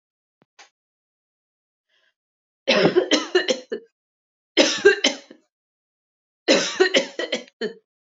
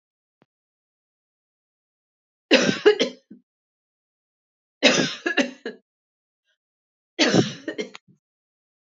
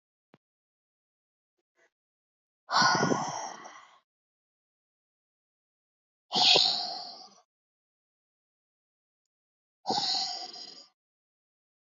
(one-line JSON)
{"cough_length": "8.2 s", "cough_amplitude": 27798, "cough_signal_mean_std_ratio": 0.36, "three_cough_length": "8.9 s", "three_cough_amplitude": 28273, "three_cough_signal_mean_std_ratio": 0.29, "exhalation_length": "11.9 s", "exhalation_amplitude": 11460, "exhalation_signal_mean_std_ratio": 0.31, "survey_phase": "alpha (2021-03-01 to 2021-08-12)", "age": "18-44", "gender": "Female", "wearing_mask": "No", "symptom_none": true, "smoker_status": "Never smoked", "respiratory_condition_asthma": false, "respiratory_condition_other": false, "recruitment_source": "REACT", "submission_delay": "2 days", "covid_test_result": "Negative", "covid_test_method": "RT-qPCR"}